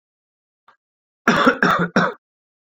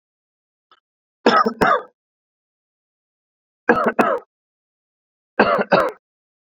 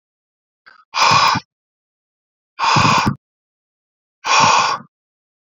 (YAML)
cough_length: 2.7 s
cough_amplitude: 27642
cough_signal_mean_std_ratio: 0.4
three_cough_length: 6.6 s
three_cough_amplitude: 32399
three_cough_signal_mean_std_ratio: 0.34
exhalation_length: 5.5 s
exhalation_amplitude: 29280
exhalation_signal_mean_std_ratio: 0.44
survey_phase: beta (2021-08-13 to 2022-03-07)
age: 18-44
gender: Male
wearing_mask: 'No'
symptom_none: true
symptom_onset: 5 days
smoker_status: Current smoker (e-cigarettes or vapes only)
respiratory_condition_asthma: false
respiratory_condition_other: false
recruitment_source: REACT
submission_delay: 4 days
covid_test_result: Negative
covid_test_method: RT-qPCR